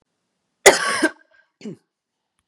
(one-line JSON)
{"cough_length": "2.5 s", "cough_amplitude": 32768, "cough_signal_mean_std_ratio": 0.26, "survey_phase": "beta (2021-08-13 to 2022-03-07)", "age": "45-64", "gender": "Female", "wearing_mask": "No", "symptom_cough_any": true, "symptom_onset": "3 days", "smoker_status": "Never smoked", "respiratory_condition_asthma": false, "respiratory_condition_other": false, "recruitment_source": "Test and Trace", "submission_delay": "2 days", "covid_test_result": "Positive", "covid_test_method": "RT-qPCR", "covid_ct_value": 15.5, "covid_ct_gene": "N gene", "covid_ct_mean": 15.7, "covid_viral_load": "6900000 copies/ml", "covid_viral_load_category": "High viral load (>1M copies/ml)"}